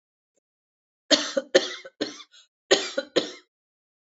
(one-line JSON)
{"cough_length": "4.2 s", "cough_amplitude": 25152, "cough_signal_mean_std_ratio": 0.3, "survey_phase": "alpha (2021-03-01 to 2021-08-12)", "age": "45-64", "gender": "Female", "wearing_mask": "No", "symptom_none": true, "smoker_status": "Never smoked", "respiratory_condition_asthma": false, "respiratory_condition_other": false, "recruitment_source": "REACT", "submission_delay": "1 day", "covid_test_result": "Negative", "covid_test_method": "RT-qPCR"}